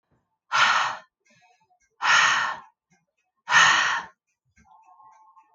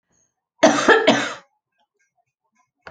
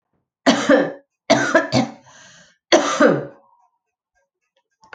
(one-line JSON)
{"exhalation_length": "5.5 s", "exhalation_amplitude": 19855, "exhalation_signal_mean_std_ratio": 0.42, "cough_length": "2.9 s", "cough_amplitude": 30633, "cough_signal_mean_std_ratio": 0.35, "three_cough_length": "4.9 s", "three_cough_amplitude": 30897, "three_cough_signal_mean_std_ratio": 0.41, "survey_phase": "beta (2021-08-13 to 2022-03-07)", "age": "45-64", "gender": "Female", "wearing_mask": "No", "symptom_cough_any": true, "symptom_runny_or_blocked_nose": true, "symptom_shortness_of_breath": true, "symptom_sore_throat": true, "symptom_diarrhoea": true, "symptom_fatigue": true, "symptom_fever_high_temperature": true, "symptom_headache": true, "smoker_status": "Never smoked", "respiratory_condition_asthma": false, "respiratory_condition_other": false, "recruitment_source": "Test and Trace", "submission_delay": "2 days", "covid_test_result": "Positive", "covid_test_method": "RT-qPCR", "covid_ct_value": 21.7, "covid_ct_gene": "ORF1ab gene"}